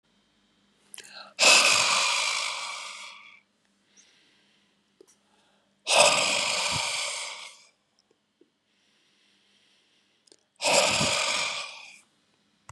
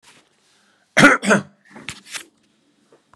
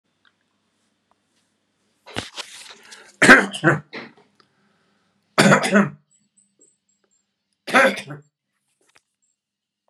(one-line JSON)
{"exhalation_length": "12.7 s", "exhalation_amplitude": 19413, "exhalation_signal_mean_std_ratio": 0.43, "cough_length": "3.2 s", "cough_amplitude": 32768, "cough_signal_mean_std_ratio": 0.28, "three_cough_length": "9.9 s", "three_cough_amplitude": 32768, "three_cough_signal_mean_std_ratio": 0.26, "survey_phase": "beta (2021-08-13 to 2022-03-07)", "age": "65+", "gender": "Male", "wearing_mask": "No", "symptom_none": true, "smoker_status": "Never smoked", "respiratory_condition_asthma": false, "respiratory_condition_other": false, "recruitment_source": "REACT", "submission_delay": "1 day", "covid_test_result": "Negative", "covid_test_method": "RT-qPCR", "influenza_a_test_result": "Negative", "influenza_b_test_result": "Negative"}